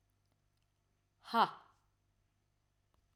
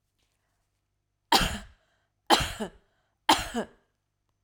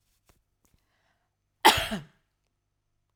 {
  "exhalation_length": "3.2 s",
  "exhalation_amplitude": 5152,
  "exhalation_signal_mean_std_ratio": 0.18,
  "three_cough_length": "4.4 s",
  "three_cough_amplitude": 22366,
  "three_cough_signal_mean_std_ratio": 0.29,
  "cough_length": "3.2 s",
  "cough_amplitude": 22153,
  "cough_signal_mean_std_ratio": 0.2,
  "survey_phase": "alpha (2021-03-01 to 2021-08-12)",
  "age": "45-64",
  "gender": "Female",
  "wearing_mask": "No",
  "symptom_none": true,
  "smoker_status": "Never smoked",
  "respiratory_condition_asthma": false,
  "respiratory_condition_other": false,
  "recruitment_source": "REACT",
  "submission_delay": "1 day",
  "covid_test_result": "Negative",
  "covid_test_method": "RT-qPCR"
}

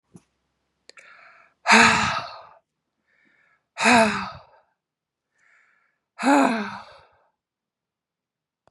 {
  "exhalation_length": "8.7 s",
  "exhalation_amplitude": 26904,
  "exhalation_signal_mean_std_ratio": 0.32,
  "survey_phase": "beta (2021-08-13 to 2022-03-07)",
  "age": "18-44",
  "gender": "Female",
  "wearing_mask": "No",
  "symptom_sore_throat": true,
  "symptom_fatigue": true,
  "symptom_headache": true,
  "symptom_other": true,
  "smoker_status": "Never smoked",
  "respiratory_condition_asthma": false,
  "respiratory_condition_other": false,
  "recruitment_source": "Test and Trace",
  "submission_delay": "1 day",
  "covid_test_result": "Positive",
  "covid_test_method": "LFT"
}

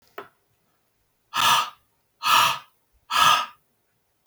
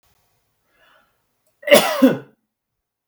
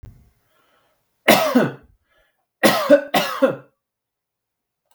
{
  "exhalation_length": "4.3 s",
  "exhalation_amplitude": 26211,
  "exhalation_signal_mean_std_ratio": 0.4,
  "cough_length": "3.1 s",
  "cough_amplitude": 32768,
  "cough_signal_mean_std_ratio": 0.27,
  "three_cough_length": "4.9 s",
  "three_cough_amplitude": 32768,
  "three_cough_signal_mean_std_ratio": 0.36,
  "survey_phase": "beta (2021-08-13 to 2022-03-07)",
  "age": "45-64",
  "gender": "Male",
  "wearing_mask": "No",
  "symptom_none": true,
  "smoker_status": "Never smoked",
  "respiratory_condition_asthma": false,
  "respiratory_condition_other": false,
  "recruitment_source": "REACT",
  "submission_delay": "2 days",
  "covid_test_result": "Negative",
  "covid_test_method": "RT-qPCR"
}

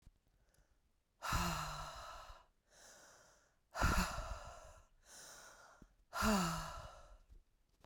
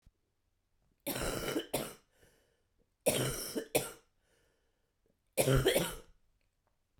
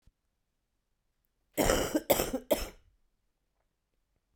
{
  "exhalation_length": "7.9 s",
  "exhalation_amplitude": 2873,
  "exhalation_signal_mean_std_ratio": 0.45,
  "three_cough_length": "7.0 s",
  "three_cough_amplitude": 6852,
  "three_cough_signal_mean_std_ratio": 0.39,
  "cough_length": "4.4 s",
  "cough_amplitude": 10796,
  "cough_signal_mean_std_ratio": 0.32,
  "survey_phase": "beta (2021-08-13 to 2022-03-07)",
  "age": "18-44",
  "gender": "Female",
  "wearing_mask": "No",
  "symptom_cough_any": true,
  "symptom_sore_throat": true,
  "symptom_headache": true,
  "smoker_status": "Current smoker (11 or more cigarettes per day)",
  "respiratory_condition_asthma": false,
  "respiratory_condition_other": false,
  "recruitment_source": "Test and Trace",
  "submission_delay": "1 day",
  "covid_test_result": "Positive",
  "covid_test_method": "ePCR"
}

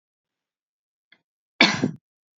{
  "cough_length": "2.4 s",
  "cough_amplitude": 31512,
  "cough_signal_mean_std_ratio": 0.23,
  "survey_phase": "beta (2021-08-13 to 2022-03-07)",
  "age": "18-44",
  "gender": "Female",
  "wearing_mask": "No",
  "symptom_none": true,
  "smoker_status": "Ex-smoker",
  "respiratory_condition_asthma": false,
  "respiratory_condition_other": false,
  "recruitment_source": "REACT",
  "submission_delay": "2 days",
  "covid_test_result": "Negative",
  "covid_test_method": "RT-qPCR"
}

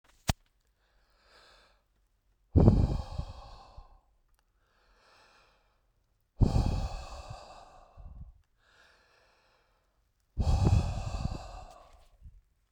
{
  "exhalation_length": "12.7 s",
  "exhalation_amplitude": 20200,
  "exhalation_signal_mean_std_ratio": 0.32,
  "survey_phase": "beta (2021-08-13 to 2022-03-07)",
  "age": "18-44",
  "gender": "Male",
  "wearing_mask": "No",
  "symptom_none": true,
  "smoker_status": "Never smoked",
  "respiratory_condition_asthma": false,
  "respiratory_condition_other": false,
  "recruitment_source": "REACT",
  "submission_delay": "2 days",
  "covid_test_result": "Negative",
  "covid_test_method": "RT-qPCR"
}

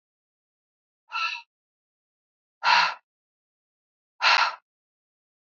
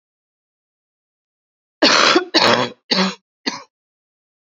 {
  "exhalation_length": "5.5 s",
  "exhalation_amplitude": 17172,
  "exhalation_signal_mean_std_ratio": 0.29,
  "cough_length": "4.5 s",
  "cough_amplitude": 30783,
  "cough_signal_mean_std_ratio": 0.37,
  "survey_phase": "beta (2021-08-13 to 2022-03-07)",
  "age": "45-64",
  "gender": "Female",
  "wearing_mask": "No",
  "symptom_cough_any": true,
  "symptom_runny_or_blocked_nose": true,
  "symptom_headache": true,
  "symptom_change_to_sense_of_smell_or_taste": true,
  "symptom_onset": "4 days",
  "smoker_status": "Never smoked",
  "respiratory_condition_asthma": false,
  "respiratory_condition_other": false,
  "recruitment_source": "Test and Trace",
  "submission_delay": "1 day",
  "covid_test_result": "Negative",
  "covid_test_method": "RT-qPCR"
}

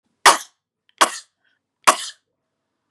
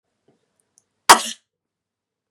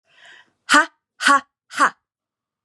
{
  "three_cough_length": "2.9 s",
  "three_cough_amplitude": 32768,
  "three_cough_signal_mean_std_ratio": 0.23,
  "cough_length": "2.3 s",
  "cough_amplitude": 32768,
  "cough_signal_mean_std_ratio": 0.16,
  "exhalation_length": "2.6 s",
  "exhalation_amplitude": 30849,
  "exhalation_signal_mean_std_ratio": 0.32,
  "survey_phase": "beta (2021-08-13 to 2022-03-07)",
  "age": "45-64",
  "gender": "Female",
  "wearing_mask": "No",
  "symptom_none": true,
  "smoker_status": "Ex-smoker",
  "respiratory_condition_asthma": false,
  "respiratory_condition_other": false,
  "recruitment_source": "REACT",
  "submission_delay": "2 days",
  "covid_test_result": "Negative",
  "covid_test_method": "RT-qPCR",
  "influenza_a_test_result": "Unknown/Void",
  "influenza_b_test_result": "Unknown/Void"
}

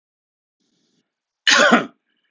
{
  "cough_length": "2.3 s",
  "cough_amplitude": 31515,
  "cough_signal_mean_std_ratio": 0.32,
  "survey_phase": "alpha (2021-03-01 to 2021-08-12)",
  "age": "18-44",
  "gender": "Male",
  "wearing_mask": "No",
  "symptom_none": true,
  "symptom_onset": "4 days",
  "smoker_status": "Ex-smoker",
  "respiratory_condition_asthma": false,
  "respiratory_condition_other": false,
  "recruitment_source": "Test and Trace",
  "submission_delay": "1 day",
  "covid_test_result": "Positive",
  "covid_test_method": "RT-qPCR"
}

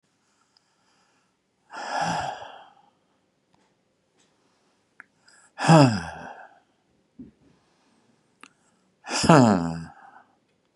{
  "exhalation_length": "10.8 s",
  "exhalation_amplitude": 32733,
  "exhalation_signal_mean_std_ratio": 0.26,
  "survey_phase": "beta (2021-08-13 to 2022-03-07)",
  "age": "65+",
  "gender": "Male",
  "wearing_mask": "No",
  "symptom_none": true,
  "smoker_status": "Ex-smoker",
  "respiratory_condition_asthma": false,
  "respiratory_condition_other": false,
  "recruitment_source": "REACT",
  "submission_delay": "2 days",
  "covid_test_result": "Negative",
  "covid_test_method": "RT-qPCR",
  "influenza_a_test_result": "Negative",
  "influenza_b_test_result": "Negative"
}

